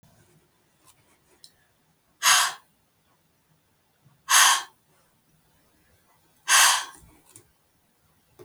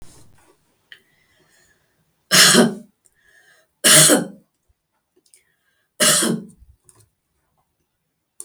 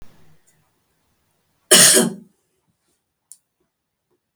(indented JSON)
{
  "exhalation_length": "8.4 s",
  "exhalation_amplitude": 20653,
  "exhalation_signal_mean_std_ratio": 0.27,
  "three_cough_length": "8.4 s",
  "three_cough_amplitude": 32768,
  "three_cough_signal_mean_std_ratio": 0.31,
  "cough_length": "4.4 s",
  "cough_amplitude": 32768,
  "cough_signal_mean_std_ratio": 0.25,
  "survey_phase": "beta (2021-08-13 to 2022-03-07)",
  "age": "65+",
  "gender": "Female",
  "wearing_mask": "No",
  "symptom_none": true,
  "smoker_status": "Never smoked",
  "respiratory_condition_asthma": false,
  "respiratory_condition_other": false,
  "recruitment_source": "REACT",
  "submission_delay": "2 days",
  "covid_test_result": "Negative",
  "covid_test_method": "RT-qPCR",
  "influenza_a_test_result": "Unknown/Void",
  "influenza_b_test_result": "Unknown/Void"
}